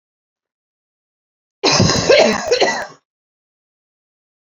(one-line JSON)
{"cough_length": "4.5 s", "cough_amplitude": 32767, "cough_signal_mean_std_ratio": 0.4, "survey_phase": "beta (2021-08-13 to 2022-03-07)", "age": "18-44", "gender": "Female", "wearing_mask": "No", "symptom_cough_any": true, "symptom_fatigue": true, "symptom_headache": true, "symptom_onset": "2 days", "smoker_status": "Never smoked", "respiratory_condition_asthma": false, "respiratory_condition_other": false, "recruitment_source": "Test and Trace", "submission_delay": "2 days", "covid_test_result": "Positive", "covid_test_method": "RT-qPCR"}